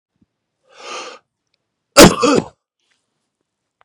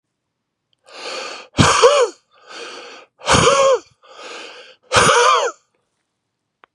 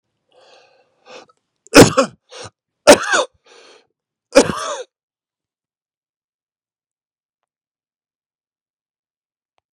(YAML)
cough_length: 3.8 s
cough_amplitude: 32768
cough_signal_mean_std_ratio: 0.25
exhalation_length: 6.7 s
exhalation_amplitude: 32767
exhalation_signal_mean_std_ratio: 0.45
three_cough_length: 9.7 s
three_cough_amplitude: 32768
three_cough_signal_mean_std_ratio: 0.2
survey_phase: beta (2021-08-13 to 2022-03-07)
age: 45-64
gender: Male
wearing_mask: 'No'
symptom_runny_or_blocked_nose: true
symptom_fatigue: true
symptom_headache: true
smoker_status: Never smoked
respiratory_condition_asthma: false
respiratory_condition_other: false
recruitment_source: Test and Trace
submission_delay: 1 day
covid_test_result: Positive
covid_test_method: RT-qPCR
covid_ct_value: 28.2
covid_ct_gene: ORF1ab gene
covid_ct_mean: 29.1
covid_viral_load: 280 copies/ml
covid_viral_load_category: Minimal viral load (< 10K copies/ml)